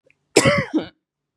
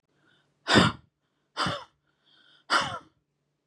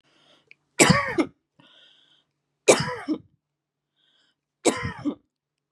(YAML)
cough_length: 1.4 s
cough_amplitude: 32767
cough_signal_mean_std_ratio: 0.41
exhalation_length: 3.7 s
exhalation_amplitude: 15951
exhalation_signal_mean_std_ratio: 0.32
three_cough_length: 5.7 s
three_cough_amplitude: 30436
three_cough_signal_mean_std_ratio: 0.3
survey_phase: beta (2021-08-13 to 2022-03-07)
age: 45-64
gender: Female
wearing_mask: 'No'
symptom_none: true
smoker_status: Never smoked
respiratory_condition_asthma: false
respiratory_condition_other: false
recruitment_source: REACT
submission_delay: 2 days
covid_test_result: Negative
covid_test_method: RT-qPCR
influenza_a_test_result: Negative
influenza_b_test_result: Negative